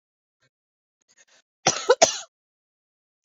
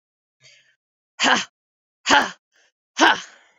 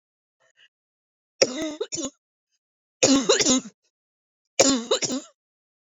{"cough_length": "3.2 s", "cough_amplitude": 29960, "cough_signal_mean_std_ratio": 0.21, "exhalation_length": "3.6 s", "exhalation_amplitude": 31629, "exhalation_signal_mean_std_ratio": 0.32, "three_cough_length": "5.8 s", "three_cough_amplitude": 26705, "three_cough_signal_mean_std_ratio": 0.38, "survey_phase": "beta (2021-08-13 to 2022-03-07)", "age": "18-44", "gender": "Female", "wearing_mask": "No", "symptom_sore_throat": true, "symptom_fatigue": true, "symptom_headache": true, "smoker_status": "Never smoked", "respiratory_condition_asthma": false, "respiratory_condition_other": false, "recruitment_source": "REACT", "submission_delay": "1 day", "covid_test_result": "Negative", "covid_test_method": "RT-qPCR"}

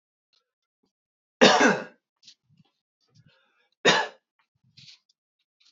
{"cough_length": "5.7 s", "cough_amplitude": 26977, "cough_signal_mean_std_ratio": 0.25, "survey_phase": "alpha (2021-03-01 to 2021-08-12)", "age": "18-44", "gender": "Male", "wearing_mask": "No", "symptom_none": true, "smoker_status": "Current smoker (e-cigarettes or vapes only)", "respiratory_condition_asthma": true, "respiratory_condition_other": false, "recruitment_source": "REACT", "submission_delay": "1 day", "covid_test_result": "Negative", "covid_test_method": "RT-qPCR"}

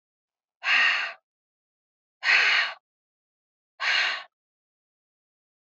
{"exhalation_length": "5.6 s", "exhalation_amplitude": 15507, "exhalation_signal_mean_std_ratio": 0.39, "survey_phase": "beta (2021-08-13 to 2022-03-07)", "age": "45-64", "gender": "Female", "wearing_mask": "No", "symptom_cough_any": true, "symptom_runny_or_blocked_nose": true, "symptom_fatigue": true, "symptom_onset": "5 days", "smoker_status": "Never smoked", "respiratory_condition_asthma": false, "respiratory_condition_other": false, "recruitment_source": "Test and Trace", "submission_delay": "1 day", "covid_test_result": "Positive", "covid_test_method": "RT-qPCR", "covid_ct_value": 17.0, "covid_ct_gene": "N gene", "covid_ct_mean": 18.0, "covid_viral_load": "1300000 copies/ml", "covid_viral_load_category": "High viral load (>1M copies/ml)"}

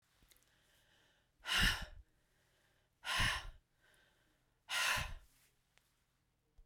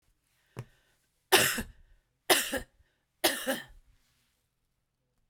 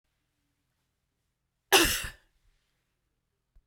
{"exhalation_length": "6.7 s", "exhalation_amplitude": 3178, "exhalation_signal_mean_std_ratio": 0.35, "three_cough_length": "5.3 s", "three_cough_amplitude": 16565, "three_cough_signal_mean_std_ratio": 0.3, "cough_length": "3.7 s", "cough_amplitude": 18427, "cough_signal_mean_std_ratio": 0.21, "survey_phase": "beta (2021-08-13 to 2022-03-07)", "age": "65+", "gender": "Female", "wearing_mask": "No", "symptom_none": true, "smoker_status": "Never smoked", "respiratory_condition_asthma": false, "respiratory_condition_other": false, "recruitment_source": "REACT", "submission_delay": "1 day", "covid_test_result": "Negative", "covid_test_method": "RT-qPCR"}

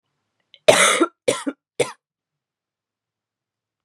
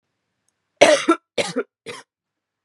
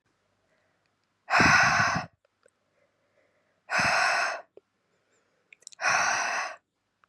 {"cough_length": "3.8 s", "cough_amplitude": 32768, "cough_signal_mean_std_ratio": 0.29, "three_cough_length": "2.6 s", "three_cough_amplitude": 32768, "three_cough_signal_mean_std_ratio": 0.31, "exhalation_length": "7.1 s", "exhalation_amplitude": 16285, "exhalation_signal_mean_std_ratio": 0.44, "survey_phase": "beta (2021-08-13 to 2022-03-07)", "age": "18-44", "gender": "Female", "wearing_mask": "No", "symptom_new_continuous_cough": true, "symptom_runny_or_blocked_nose": true, "symptom_shortness_of_breath": true, "symptom_sore_throat": true, "symptom_fever_high_temperature": true, "symptom_headache": true, "symptom_change_to_sense_of_smell_or_taste": true, "smoker_status": "Never smoked", "respiratory_condition_asthma": false, "respiratory_condition_other": false, "recruitment_source": "Test and Trace", "submission_delay": "2 days", "covid_test_result": "Positive", "covid_test_method": "LFT"}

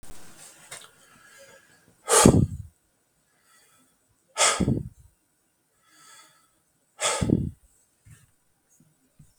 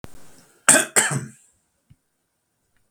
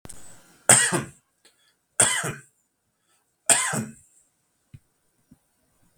{"exhalation_length": "9.4 s", "exhalation_amplitude": 32766, "exhalation_signal_mean_std_ratio": 0.29, "cough_length": "2.9 s", "cough_amplitude": 32768, "cough_signal_mean_std_ratio": 0.29, "three_cough_length": "6.0 s", "three_cough_amplitude": 32768, "three_cough_signal_mean_std_ratio": 0.3, "survey_phase": "beta (2021-08-13 to 2022-03-07)", "age": "45-64", "gender": "Male", "wearing_mask": "No", "symptom_none": true, "smoker_status": "Never smoked", "respiratory_condition_asthma": false, "respiratory_condition_other": false, "recruitment_source": "REACT", "submission_delay": "0 days", "covid_test_result": "Negative", "covid_test_method": "RT-qPCR"}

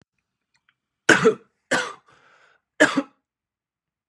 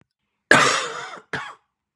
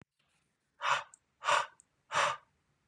{"three_cough_length": "4.1 s", "three_cough_amplitude": 30336, "three_cough_signal_mean_std_ratio": 0.27, "cough_length": "2.0 s", "cough_amplitude": 32768, "cough_signal_mean_std_ratio": 0.39, "exhalation_length": "2.9 s", "exhalation_amplitude": 5503, "exhalation_signal_mean_std_ratio": 0.38, "survey_phase": "beta (2021-08-13 to 2022-03-07)", "age": "45-64", "gender": "Male", "wearing_mask": "No", "symptom_cough_any": true, "symptom_sore_throat": true, "symptom_headache": true, "smoker_status": "Never smoked", "respiratory_condition_asthma": false, "respiratory_condition_other": false, "recruitment_source": "Test and Trace", "submission_delay": "2 days", "covid_test_result": "Positive", "covid_test_method": "RT-qPCR", "covid_ct_value": 27.3, "covid_ct_gene": "N gene"}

